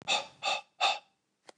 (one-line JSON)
{"exhalation_length": "1.6 s", "exhalation_amplitude": 6520, "exhalation_signal_mean_std_ratio": 0.47, "survey_phase": "beta (2021-08-13 to 2022-03-07)", "age": "45-64", "gender": "Male", "wearing_mask": "No", "symptom_runny_or_blocked_nose": true, "symptom_shortness_of_breath": true, "symptom_abdominal_pain": true, "symptom_diarrhoea": true, "symptom_fatigue": true, "symptom_fever_high_temperature": true, "symptom_headache": true, "symptom_onset": "2 days", "smoker_status": "Never smoked", "respiratory_condition_asthma": true, "respiratory_condition_other": false, "recruitment_source": "Test and Trace", "submission_delay": "1 day", "covid_test_result": "Positive", "covid_test_method": "ePCR"}